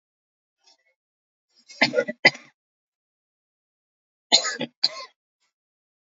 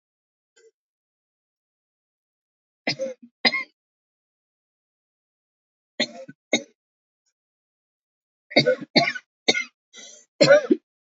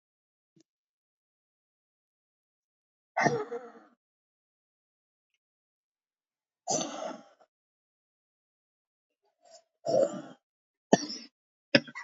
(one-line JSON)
{"cough_length": "6.1 s", "cough_amplitude": 27233, "cough_signal_mean_std_ratio": 0.21, "three_cough_length": "11.1 s", "three_cough_amplitude": 25720, "three_cough_signal_mean_std_ratio": 0.24, "exhalation_length": "12.0 s", "exhalation_amplitude": 21176, "exhalation_signal_mean_std_ratio": 0.22, "survey_phase": "alpha (2021-03-01 to 2021-08-12)", "age": "45-64", "gender": "Female", "wearing_mask": "No", "symptom_cough_any": true, "symptom_shortness_of_breath": true, "symptom_headache": true, "symptom_onset": "5 days", "smoker_status": "Current smoker (11 or more cigarettes per day)", "respiratory_condition_asthma": true, "respiratory_condition_other": false, "recruitment_source": "REACT", "submission_delay": "6 days", "covid_test_result": "Negative", "covid_test_method": "RT-qPCR"}